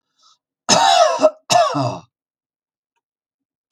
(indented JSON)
{
  "cough_length": "3.7 s",
  "cough_amplitude": 32768,
  "cough_signal_mean_std_ratio": 0.43,
  "survey_phase": "beta (2021-08-13 to 2022-03-07)",
  "age": "65+",
  "gender": "Male",
  "wearing_mask": "No",
  "symptom_none": true,
  "smoker_status": "Never smoked",
  "respiratory_condition_asthma": false,
  "respiratory_condition_other": false,
  "recruitment_source": "REACT",
  "submission_delay": "7 days",
  "covid_test_result": "Negative",
  "covid_test_method": "RT-qPCR"
}